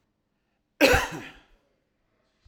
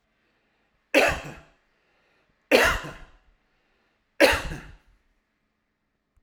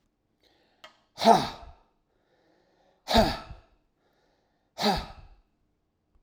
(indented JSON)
{
  "cough_length": "2.5 s",
  "cough_amplitude": 18500,
  "cough_signal_mean_std_ratio": 0.27,
  "three_cough_length": "6.2 s",
  "three_cough_amplitude": 24443,
  "three_cough_signal_mean_std_ratio": 0.29,
  "exhalation_length": "6.2 s",
  "exhalation_amplitude": 19777,
  "exhalation_signal_mean_std_ratio": 0.27,
  "survey_phase": "alpha (2021-03-01 to 2021-08-12)",
  "age": "65+",
  "gender": "Male",
  "wearing_mask": "No",
  "symptom_none": true,
  "smoker_status": "Never smoked",
  "respiratory_condition_asthma": false,
  "respiratory_condition_other": false,
  "recruitment_source": "REACT",
  "submission_delay": "2 days",
  "covid_test_result": "Negative",
  "covid_test_method": "RT-qPCR"
}